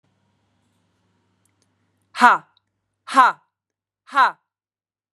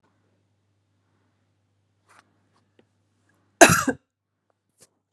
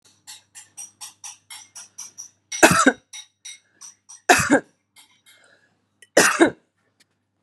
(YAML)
exhalation_length: 5.1 s
exhalation_amplitude: 32760
exhalation_signal_mean_std_ratio: 0.24
cough_length: 5.1 s
cough_amplitude: 32768
cough_signal_mean_std_ratio: 0.15
three_cough_length: 7.4 s
three_cough_amplitude: 32767
three_cough_signal_mean_std_ratio: 0.29
survey_phase: beta (2021-08-13 to 2022-03-07)
age: 18-44
gender: Female
wearing_mask: 'No'
symptom_none: true
smoker_status: Ex-smoker
respiratory_condition_asthma: false
respiratory_condition_other: false
recruitment_source: REACT
submission_delay: 10 days
covid_test_result: Negative
covid_test_method: RT-qPCR
influenza_a_test_result: Negative
influenza_b_test_result: Negative